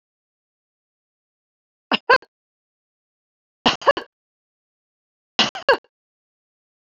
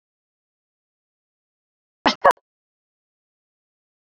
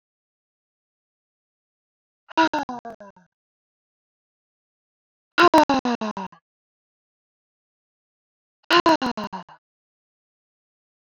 three_cough_length: 6.9 s
three_cough_amplitude: 26800
three_cough_signal_mean_std_ratio: 0.19
cough_length: 4.1 s
cough_amplitude: 26424
cough_signal_mean_std_ratio: 0.14
exhalation_length: 11.0 s
exhalation_amplitude: 23720
exhalation_signal_mean_std_ratio: 0.25
survey_phase: beta (2021-08-13 to 2022-03-07)
age: 45-64
gender: Female
wearing_mask: 'No'
symptom_none: true
smoker_status: Never smoked
respiratory_condition_asthma: false
respiratory_condition_other: false
recruitment_source: REACT
submission_delay: 1 day
covid_test_result: Negative
covid_test_method: RT-qPCR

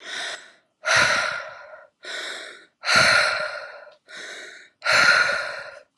exhalation_length: 6.0 s
exhalation_amplitude: 18900
exhalation_signal_mean_std_ratio: 0.55
survey_phase: alpha (2021-03-01 to 2021-08-12)
age: 18-44
gender: Female
wearing_mask: 'No'
symptom_cough_any: true
symptom_new_continuous_cough: true
symptom_abdominal_pain: true
symptom_diarrhoea: true
symptom_fever_high_temperature: true
symptom_headache: true
symptom_change_to_sense_of_smell_or_taste: true
symptom_onset: 11 days
smoker_status: Prefer not to say
respiratory_condition_asthma: false
respiratory_condition_other: false
recruitment_source: Test and Trace
submission_delay: 3 days
covid_test_result: Positive
covid_test_method: ePCR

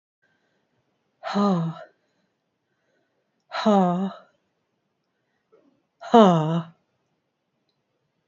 exhalation_length: 8.3 s
exhalation_amplitude: 26754
exhalation_signal_mean_std_ratio: 0.32
survey_phase: beta (2021-08-13 to 2022-03-07)
age: 45-64
gender: Female
wearing_mask: 'No'
symptom_runny_or_blocked_nose: true
symptom_headache: true
smoker_status: Never smoked
respiratory_condition_asthma: true
respiratory_condition_other: false
recruitment_source: Test and Trace
submission_delay: 3 days
covid_test_result: Negative
covid_test_method: RT-qPCR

